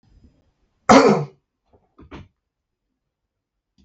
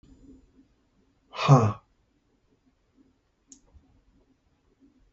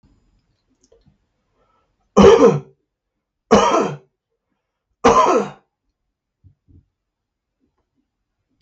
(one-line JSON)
{"cough_length": "3.8 s", "cough_amplitude": 32768, "cough_signal_mean_std_ratio": 0.23, "exhalation_length": "5.1 s", "exhalation_amplitude": 19022, "exhalation_signal_mean_std_ratio": 0.2, "three_cough_length": "8.6 s", "three_cough_amplitude": 32768, "three_cough_signal_mean_std_ratio": 0.3, "survey_phase": "beta (2021-08-13 to 2022-03-07)", "age": "45-64", "gender": "Male", "wearing_mask": "No", "symptom_cough_any": true, "symptom_runny_or_blocked_nose": true, "symptom_fatigue": true, "symptom_headache": true, "smoker_status": "Never smoked", "respiratory_condition_asthma": false, "respiratory_condition_other": false, "recruitment_source": "Test and Trace", "submission_delay": "2 days", "covid_test_result": "Positive", "covid_test_method": "RT-qPCR"}